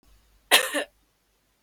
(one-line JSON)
{"cough_length": "1.6 s", "cough_amplitude": 32095, "cough_signal_mean_std_ratio": 0.28, "survey_phase": "beta (2021-08-13 to 2022-03-07)", "age": "18-44", "gender": "Female", "wearing_mask": "No", "symptom_cough_any": true, "symptom_onset": "4 days", "smoker_status": "Never smoked", "respiratory_condition_asthma": true, "respiratory_condition_other": false, "recruitment_source": "REACT", "submission_delay": "4 days", "covid_test_result": "Negative", "covid_test_method": "RT-qPCR"}